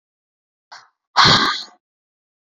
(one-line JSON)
{"exhalation_length": "2.5 s", "exhalation_amplitude": 32318, "exhalation_signal_mean_std_ratio": 0.33, "survey_phase": "beta (2021-08-13 to 2022-03-07)", "age": "18-44", "gender": "Female", "wearing_mask": "No", "symptom_none": true, "smoker_status": "Never smoked", "respiratory_condition_asthma": false, "respiratory_condition_other": false, "recruitment_source": "REACT", "submission_delay": "3 days", "covid_test_result": "Negative", "covid_test_method": "RT-qPCR"}